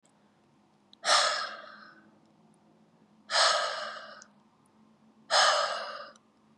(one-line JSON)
{"exhalation_length": "6.6 s", "exhalation_amplitude": 9955, "exhalation_signal_mean_std_ratio": 0.41, "survey_phase": "beta (2021-08-13 to 2022-03-07)", "age": "18-44", "gender": "Female", "wearing_mask": "No", "symptom_none": true, "smoker_status": "Never smoked", "respiratory_condition_asthma": false, "respiratory_condition_other": false, "recruitment_source": "REACT", "submission_delay": "0 days", "covid_test_result": "Negative", "covid_test_method": "RT-qPCR", "influenza_a_test_result": "Negative", "influenza_b_test_result": "Negative"}